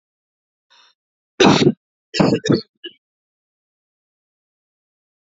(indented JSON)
{
  "three_cough_length": "5.3 s",
  "three_cough_amplitude": 28437,
  "three_cough_signal_mean_std_ratio": 0.28,
  "survey_phase": "beta (2021-08-13 to 2022-03-07)",
  "age": "18-44",
  "gender": "Female",
  "wearing_mask": "No",
  "symptom_cough_any": true,
  "symptom_runny_or_blocked_nose": true,
  "symptom_sore_throat": true,
  "symptom_fatigue": true,
  "symptom_headache": true,
  "symptom_onset": "6 days",
  "smoker_status": "Never smoked",
  "respiratory_condition_asthma": false,
  "respiratory_condition_other": false,
  "recruitment_source": "Test and Trace",
  "submission_delay": "1 day",
  "covid_test_result": "Positive",
  "covid_test_method": "ePCR"
}